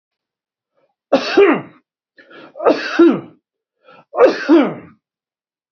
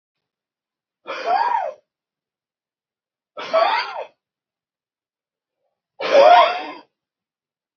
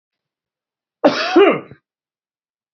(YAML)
three_cough_length: 5.7 s
three_cough_amplitude: 30123
three_cough_signal_mean_std_ratio: 0.4
exhalation_length: 7.8 s
exhalation_amplitude: 30885
exhalation_signal_mean_std_ratio: 0.33
cough_length: 2.7 s
cough_amplitude: 27678
cough_signal_mean_std_ratio: 0.33
survey_phase: beta (2021-08-13 to 2022-03-07)
age: 45-64
gender: Male
wearing_mask: 'No'
symptom_none: true
smoker_status: Never smoked
respiratory_condition_asthma: false
respiratory_condition_other: false
recruitment_source: REACT
submission_delay: 1 day
covid_test_result: Negative
covid_test_method: RT-qPCR
influenza_a_test_result: Unknown/Void
influenza_b_test_result: Unknown/Void